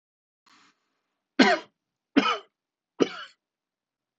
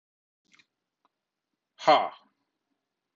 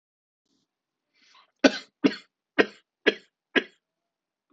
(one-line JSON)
{"three_cough_length": "4.2 s", "three_cough_amplitude": 20220, "three_cough_signal_mean_std_ratio": 0.25, "exhalation_length": "3.2 s", "exhalation_amplitude": 12836, "exhalation_signal_mean_std_ratio": 0.2, "cough_length": "4.5 s", "cough_amplitude": 23167, "cough_signal_mean_std_ratio": 0.2, "survey_phase": "alpha (2021-03-01 to 2021-08-12)", "age": "45-64", "gender": "Male", "wearing_mask": "No", "symptom_none": true, "smoker_status": "Never smoked", "respiratory_condition_asthma": false, "respiratory_condition_other": false, "recruitment_source": "REACT", "submission_delay": "1 day", "covid_test_result": "Negative", "covid_test_method": "RT-qPCR"}